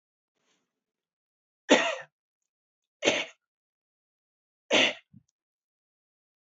three_cough_length: 6.6 s
three_cough_amplitude: 15367
three_cough_signal_mean_std_ratio: 0.23
survey_phase: beta (2021-08-13 to 2022-03-07)
age: 45-64
gender: Male
wearing_mask: 'No'
symptom_none: true
smoker_status: Never smoked
respiratory_condition_asthma: false
respiratory_condition_other: false
recruitment_source: REACT
submission_delay: 1 day
covid_test_result: Negative
covid_test_method: RT-qPCR
influenza_a_test_result: Negative
influenza_b_test_result: Negative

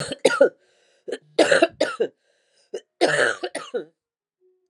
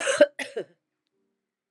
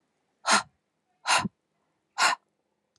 three_cough_length: 4.7 s
three_cough_amplitude: 25960
three_cough_signal_mean_std_ratio: 0.4
cough_length: 1.7 s
cough_amplitude: 19252
cough_signal_mean_std_ratio: 0.29
exhalation_length: 3.0 s
exhalation_amplitude: 13861
exhalation_signal_mean_std_ratio: 0.33
survey_phase: alpha (2021-03-01 to 2021-08-12)
age: 45-64
gender: Female
wearing_mask: 'No'
symptom_cough_any: true
symptom_new_continuous_cough: true
symptom_shortness_of_breath: true
symptom_fatigue: true
symptom_headache: true
symptom_change_to_sense_of_smell_or_taste: true
symptom_loss_of_taste: true
symptom_onset: 4 days
smoker_status: Never smoked
respiratory_condition_asthma: false
respiratory_condition_other: false
recruitment_source: Test and Trace
submission_delay: 1 day
covid_test_result: Positive
covid_test_method: RT-qPCR
covid_ct_value: 11.5
covid_ct_gene: ORF1ab gene
covid_ct_mean: 12.1
covid_viral_load: 110000000 copies/ml
covid_viral_load_category: High viral load (>1M copies/ml)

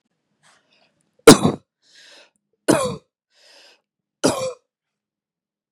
three_cough_length: 5.7 s
three_cough_amplitude: 32768
three_cough_signal_mean_std_ratio: 0.21
survey_phase: beta (2021-08-13 to 2022-03-07)
age: 18-44
gender: Female
wearing_mask: 'No'
symptom_cough_any: true
symptom_headache: true
smoker_status: Ex-smoker
respiratory_condition_asthma: false
respiratory_condition_other: false
recruitment_source: REACT
submission_delay: 0 days
covid_test_result: Negative
covid_test_method: RT-qPCR
influenza_a_test_result: Negative
influenza_b_test_result: Negative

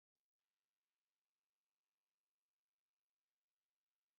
cough_length: 4.2 s
cough_amplitude: 4
cough_signal_mean_std_ratio: 0.19
survey_phase: beta (2021-08-13 to 2022-03-07)
age: 45-64
gender: Male
wearing_mask: 'No'
symptom_sore_throat: true
symptom_headache: true
symptom_onset: 13 days
smoker_status: Ex-smoker
respiratory_condition_asthma: false
respiratory_condition_other: true
recruitment_source: REACT
submission_delay: 2 days
covid_test_result: Negative
covid_test_method: RT-qPCR
influenza_a_test_result: Negative
influenza_b_test_result: Negative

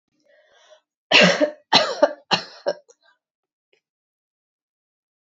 three_cough_length: 5.2 s
three_cough_amplitude: 30153
three_cough_signal_mean_std_ratio: 0.29
survey_phase: beta (2021-08-13 to 2022-03-07)
age: 18-44
gender: Female
wearing_mask: 'No'
symptom_fatigue: true
symptom_headache: true
symptom_onset: 11 days
smoker_status: Never smoked
respiratory_condition_asthma: false
respiratory_condition_other: false
recruitment_source: REACT
submission_delay: 3 days
covid_test_result: Negative
covid_test_method: RT-qPCR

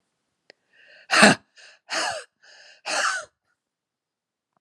exhalation_length: 4.6 s
exhalation_amplitude: 32767
exhalation_signal_mean_std_ratio: 0.29
survey_phase: beta (2021-08-13 to 2022-03-07)
age: 65+
gender: Female
wearing_mask: 'No'
symptom_cough_any: true
symptom_new_continuous_cough: true
symptom_runny_or_blocked_nose: true
symptom_shortness_of_breath: true
symptom_sore_throat: true
symptom_diarrhoea: true
symptom_fatigue: true
symptom_change_to_sense_of_smell_or_taste: true
symptom_loss_of_taste: true
symptom_onset: 6 days
smoker_status: Never smoked
respiratory_condition_asthma: false
respiratory_condition_other: false
recruitment_source: Test and Trace
submission_delay: 2 days
covid_test_result: Positive
covid_test_method: RT-qPCR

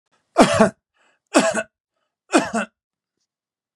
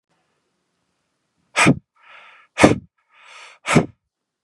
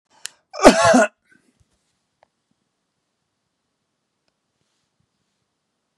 three_cough_length: 3.8 s
three_cough_amplitude: 32767
three_cough_signal_mean_std_ratio: 0.33
exhalation_length: 4.4 s
exhalation_amplitude: 32768
exhalation_signal_mean_std_ratio: 0.26
cough_length: 6.0 s
cough_amplitude: 32768
cough_signal_mean_std_ratio: 0.21
survey_phase: beta (2021-08-13 to 2022-03-07)
age: 45-64
gender: Male
wearing_mask: 'No'
symptom_none: true
smoker_status: Never smoked
respiratory_condition_asthma: false
respiratory_condition_other: false
recruitment_source: REACT
submission_delay: 0 days
covid_test_result: Negative
covid_test_method: RT-qPCR
influenza_a_test_result: Negative
influenza_b_test_result: Negative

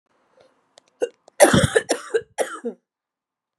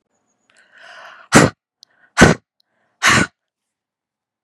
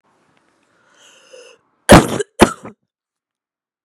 three_cough_length: 3.6 s
three_cough_amplitude: 32768
three_cough_signal_mean_std_ratio: 0.32
exhalation_length: 4.4 s
exhalation_amplitude: 32768
exhalation_signal_mean_std_ratio: 0.28
cough_length: 3.8 s
cough_amplitude: 32768
cough_signal_mean_std_ratio: 0.23
survey_phase: beta (2021-08-13 to 2022-03-07)
age: 45-64
gender: Female
wearing_mask: 'No'
symptom_cough_any: true
symptom_runny_or_blocked_nose: true
symptom_diarrhoea: true
symptom_headache: true
symptom_other: true
smoker_status: Ex-smoker
respiratory_condition_asthma: true
respiratory_condition_other: false
recruitment_source: Test and Trace
submission_delay: 2 days
covid_test_result: Positive
covid_test_method: RT-qPCR
covid_ct_value: 27.0
covid_ct_gene: ORF1ab gene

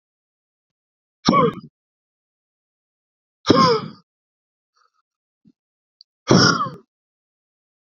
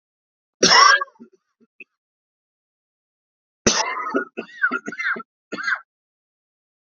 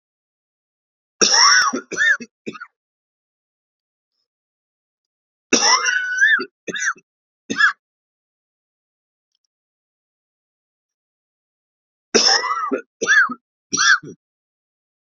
exhalation_length: 7.9 s
exhalation_amplitude: 27479
exhalation_signal_mean_std_ratio: 0.28
cough_length: 6.8 s
cough_amplitude: 29835
cough_signal_mean_std_ratio: 0.33
three_cough_length: 15.1 s
three_cough_amplitude: 31423
three_cough_signal_mean_std_ratio: 0.37
survey_phase: beta (2021-08-13 to 2022-03-07)
age: 18-44
gender: Male
wearing_mask: 'No'
symptom_cough_any: true
symptom_new_continuous_cough: true
symptom_sore_throat: true
symptom_fatigue: true
symptom_headache: true
smoker_status: Never smoked
respiratory_condition_asthma: false
respiratory_condition_other: false
recruitment_source: Test and Trace
submission_delay: 1 day
covid_test_result: Positive
covid_test_method: RT-qPCR
covid_ct_value: 24.7
covid_ct_gene: ORF1ab gene
covid_ct_mean: 24.9
covid_viral_load: 6800 copies/ml
covid_viral_load_category: Minimal viral load (< 10K copies/ml)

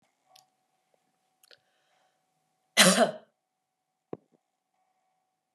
cough_length: 5.5 s
cough_amplitude: 22178
cough_signal_mean_std_ratio: 0.19
survey_phase: beta (2021-08-13 to 2022-03-07)
age: 18-44
gender: Male
wearing_mask: 'No'
symptom_runny_or_blocked_nose: true
symptom_fatigue: true
symptom_other: true
smoker_status: Never smoked
respiratory_condition_asthma: false
respiratory_condition_other: false
recruitment_source: Test and Trace
submission_delay: 3 days
covid_test_result: Positive
covid_test_method: RT-qPCR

